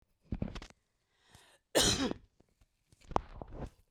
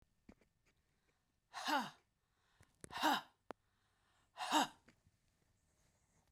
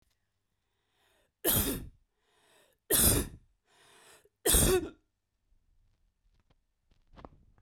{"cough_length": "3.9 s", "cough_amplitude": 10756, "cough_signal_mean_std_ratio": 0.34, "exhalation_length": "6.3 s", "exhalation_amplitude": 2704, "exhalation_signal_mean_std_ratio": 0.29, "three_cough_length": "7.6 s", "three_cough_amplitude": 8893, "three_cough_signal_mean_std_ratio": 0.32, "survey_phase": "beta (2021-08-13 to 2022-03-07)", "age": "45-64", "gender": "Female", "wearing_mask": "No", "symptom_none": true, "smoker_status": "Never smoked", "respiratory_condition_asthma": false, "respiratory_condition_other": false, "recruitment_source": "REACT", "submission_delay": "2 days", "covid_test_result": "Negative", "covid_test_method": "RT-qPCR", "influenza_a_test_result": "Negative", "influenza_b_test_result": "Negative"}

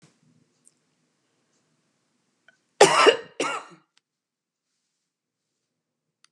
{"cough_length": "6.3 s", "cough_amplitude": 30178, "cough_signal_mean_std_ratio": 0.2, "survey_phase": "beta (2021-08-13 to 2022-03-07)", "age": "65+", "gender": "Female", "wearing_mask": "No", "symptom_none": true, "smoker_status": "Never smoked", "respiratory_condition_asthma": false, "respiratory_condition_other": false, "recruitment_source": "REACT", "submission_delay": "1 day", "covid_test_result": "Negative", "covid_test_method": "RT-qPCR", "influenza_a_test_result": "Negative", "influenza_b_test_result": "Negative"}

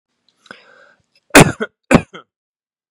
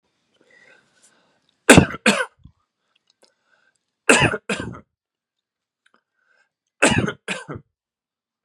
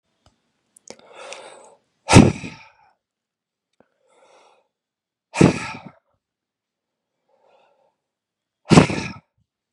{"cough_length": "2.9 s", "cough_amplitude": 32768, "cough_signal_mean_std_ratio": 0.24, "three_cough_length": "8.4 s", "three_cough_amplitude": 32768, "three_cough_signal_mean_std_ratio": 0.25, "exhalation_length": "9.7 s", "exhalation_amplitude": 32768, "exhalation_signal_mean_std_ratio": 0.2, "survey_phase": "beta (2021-08-13 to 2022-03-07)", "age": "18-44", "gender": "Male", "wearing_mask": "No", "symptom_none": true, "smoker_status": "Ex-smoker", "respiratory_condition_asthma": false, "respiratory_condition_other": false, "recruitment_source": "REACT", "submission_delay": "5 days", "covid_test_result": "Negative", "covid_test_method": "RT-qPCR", "influenza_a_test_result": "Negative", "influenza_b_test_result": "Negative"}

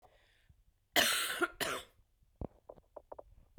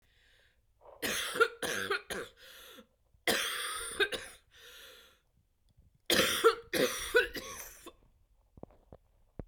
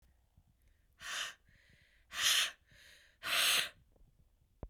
{"cough_length": "3.6 s", "cough_amplitude": 6680, "cough_signal_mean_std_ratio": 0.37, "three_cough_length": "9.5 s", "three_cough_amplitude": 7561, "three_cough_signal_mean_std_ratio": 0.42, "exhalation_length": "4.7 s", "exhalation_amplitude": 6357, "exhalation_signal_mean_std_ratio": 0.39, "survey_phase": "beta (2021-08-13 to 2022-03-07)", "age": "18-44", "gender": "Female", "wearing_mask": "No", "symptom_new_continuous_cough": true, "symptom_runny_or_blocked_nose": true, "symptom_shortness_of_breath": true, "symptom_fatigue": true, "symptom_headache": true, "symptom_change_to_sense_of_smell_or_taste": true, "symptom_loss_of_taste": true, "symptom_other": true, "smoker_status": "Never smoked", "respiratory_condition_asthma": false, "respiratory_condition_other": false, "recruitment_source": "Test and Trace", "submission_delay": "2 days", "covid_test_result": "Positive", "covid_test_method": "RT-qPCR", "covid_ct_value": 21.3, "covid_ct_gene": "N gene", "covid_ct_mean": 21.9, "covid_viral_load": "67000 copies/ml", "covid_viral_load_category": "Low viral load (10K-1M copies/ml)"}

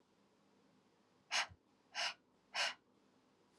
{"exhalation_length": "3.6 s", "exhalation_amplitude": 2424, "exhalation_signal_mean_std_ratio": 0.33, "survey_phase": "alpha (2021-03-01 to 2021-08-12)", "age": "18-44", "gender": "Female", "wearing_mask": "No", "symptom_cough_any": true, "symptom_new_continuous_cough": true, "symptom_headache": true, "smoker_status": "Never smoked", "respiratory_condition_asthma": false, "respiratory_condition_other": false, "recruitment_source": "Test and Trace", "submission_delay": "2 days", "covid_test_result": "Positive", "covid_test_method": "LFT"}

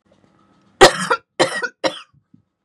{"three_cough_length": "2.6 s", "three_cough_amplitude": 32768, "three_cough_signal_mean_std_ratio": 0.3, "survey_phase": "beta (2021-08-13 to 2022-03-07)", "age": "18-44", "gender": "Female", "wearing_mask": "No", "symptom_cough_any": true, "symptom_runny_or_blocked_nose": true, "symptom_sore_throat": true, "symptom_onset": "6 days", "smoker_status": "Never smoked", "respiratory_condition_asthma": false, "respiratory_condition_other": false, "recruitment_source": "Test and Trace", "submission_delay": "2 days", "covid_test_result": "Negative", "covid_test_method": "ePCR"}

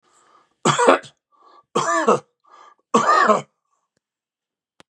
{"three_cough_length": "4.9 s", "three_cough_amplitude": 32221, "three_cough_signal_mean_std_ratio": 0.39, "survey_phase": "beta (2021-08-13 to 2022-03-07)", "age": "45-64", "gender": "Male", "wearing_mask": "No", "symptom_none": true, "smoker_status": "Never smoked", "respiratory_condition_asthma": false, "respiratory_condition_other": false, "recruitment_source": "REACT", "submission_delay": "2 days", "covid_test_result": "Negative", "covid_test_method": "RT-qPCR", "influenza_a_test_result": "Negative", "influenza_b_test_result": "Negative"}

